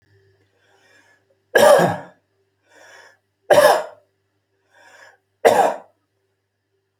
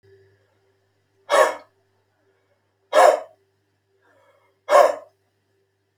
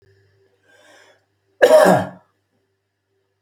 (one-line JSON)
{"three_cough_length": "7.0 s", "three_cough_amplitude": 30188, "three_cough_signal_mean_std_ratio": 0.31, "exhalation_length": "6.0 s", "exhalation_amplitude": 29572, "exhalation_signal_mean_std_ratio": 0.27, "cough_length": "3.4 s", "cough_amplitude": 29367, "cough_signal_mean_std_ratio": 0.29, "survey_phase": "alpha (2021-03-01 to 2021-08-12)", "age": "45-64", "gender": "Male", "wearing_mask": "No", "symptom_fatigue": true, "smoker_status": "Ex-smoker", "respiratory_condition_asthma": false, "respiratory_condition_other": false, "recruitment_source": "REACT", "submission_delay": "2 days", "covid_test_result": "Negative", "covid_test_method": "RT-qPCR"}